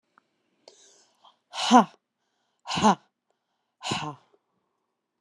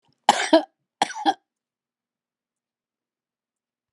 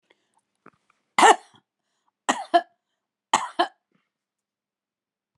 {"exhalation_length": "5.2 s", "exhalation_amplitude": 23264, "exhalation_signal_mean_std_ratio": 0.24, "cough_length": "3.9 s", "cough_amplitude": 30339, "cough_signal_mean_std_ratio": 0.23, "three_cough_length": "5.4 s", "three_cough_amplitude": 29192, "three_cough_signal_mean_std_ratio": 0.22, "survey_phase": "beta (2021-08-13 to 2022-03-07)", "age": "65+", "gender": "Female", "wearing_mask": "No", "symptom_none": true, "smoker_status": "Never smoked", "respiratory_condition_asthma": true, "respiratory_condition_other": false, "recruitment_source": "REACT", "submission_delay": "1 day", "covid_test_method": "RT-qPCR"}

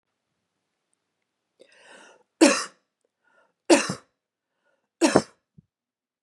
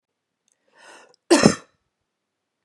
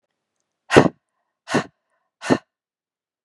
{"three_cough_length": "6.2 s", "three_cough_amplitude": 29324, "three_cough_signal_mean_std_ratio": 0.22, "cough_length": "2.6 s", "cough_amplitude": 32768, "cough_signal_mean_std_ratio": 0.22, "exhalation_length": "3.2 s", "exhalation_amplitude": 32768, "exhalation_signal_mean_std_ratio": 0.23, "survey_phase": "beta (2021-08-13 to 2022-03-07)", "age": "18-44", "gender": "Female", "wearing_mask": "No", "symptom_cough_any": true, "symptom_runny_or_blocked_nose": true, "symptom_sore_throat": true, "symptom_fatigue": true, "symptom_headache": true, "symptom_change_to_sense_of_smell_or_taste": true, "symptom_onset": "6 days", "smoker_status": "Never smoked", "respiratory_condition_asthma": false, "respiratory_condition_other": false, "recruitment_source": "Test and Trace", "submission_delay": "2 days", "covid_test_result": "Positive", "covid_test_method": "RT-qPCR", "covid_ct_value": 18.2, "covid_ct_gene": "ORF1ab gene", "covid_ct_mean": 18.3, "covid_viral_load": "990000 copies/ml", "covid_viral_load_category": "Low viral load (10K-1M copies/ml)"}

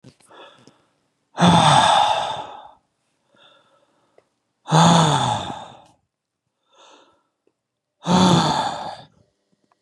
{"exhalation_length": "9.8 s", "exhalation_amplitude": 30046, "exhalation_signal_mean_std_ratio": 0.42, "survey_phase": "beta (2021-08-13 to 2022-03-07)", "age": "45-64", "gender": "Male", "wearing_mask": "No", "symptom_none": true, "smoker_status": "Ex-smoker", "respiratory_condition_asthma": false, "respiratory_condition_other": false, "recruitment_source": "REACT", "submission_delay": "9 days", "covid_test_result": "Negative", "covid_test_method": "RT-qPCR", "influenza_a_test_result": "Negative", "influenza_b_test_result": "Negative"}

